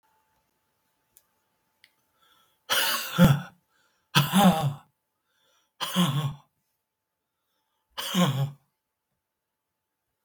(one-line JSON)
{"exhalation_length": "10.2 s", "exhalation_amplitude": 19161, "exhalation_signal_mean_std_ratio": 0.34, "survey_phase": "beta (2021-08-13 to 2022-03-07)", "age": "65+", "gender": "Male", "wearing_mask": "No", "symptom_none": true, "smoker_status": "Ex-smoker", "respiratory_condition_asthma": false, "respiratory_condition_other": false, "recruitment_source": "REACT", "submission_delay": "1 day", "covid_test_result": "Negative", "covid_test_method": "RT-qPCR", "influenza_a_test_result": "Negative", "influenza_b_test_result": "Negative"}